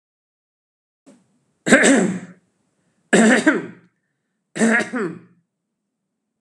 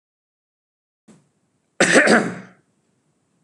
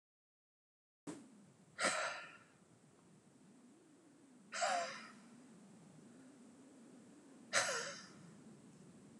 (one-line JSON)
{"three_cough_length": "6.4 s", "three_cough_amplitude": 32768, "three_cough_signal_mean_std_ratio": 0.37, "cough_length": "3.4 s", "cough_amplitude": 31797, "cough_signal_mean_std_ratio": 0.3, "exhalation_length": "9.2 s", "exhalation_amplitude": 3747, "exhalation_signal_mean_std_ratio": 0.41, "survey_phase": "beta (2021-08-13 to 2022-03-07)", "age": "45-64", "gender": "Male", "wearing_mask": "No", "symptom_none": true, "smoker_status": "Ex-smoker", "respiratory_condition_asthma": false, "respiratory_condition_other": false, "recruitment_source": "REACT", "submission_delay": "2 days", "covid_test_result": "Negative", "covid_test_method": "RT-qPCR", "influenza_a_test_result": "Negative", "influenza_b_test_result": "Negative"}